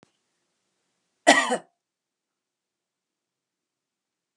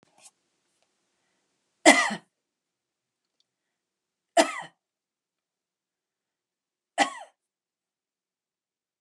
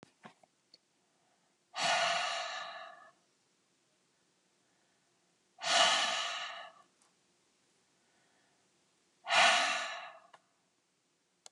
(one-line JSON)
{"cough_length": "4.4 s", "cough_amplitude": 28145, "cough_signal_mean_std_ratio": 0.18, "three_cough_length": "9.0 s", "three_cough_amplitude": 29657, "three_cough_signal_mean_std_ratio": 0.17, "exhalation_length": "11.5 s", "exhalation_amplitude": 6201, "exhalation_signal_mean_std_ratio": 0.36, "survey_phase": "beta (2021-08-13 to 2022-03-07)", "age": "65+", "gender": "Female", "wearing_mask": "No", "symptom_none": true, "smoker_status": "Never smoked", "respiratory_condition_asthma": false, "respiratory_condition_other": false, "recruitment_source": "REACT", "submission_delay": "7 days", "covid_test_result": "Negative", "covid_test_method": "RT-qPCR", "influenza_a_test_result": "Negative", "influenza_b_test_result": "Negative"}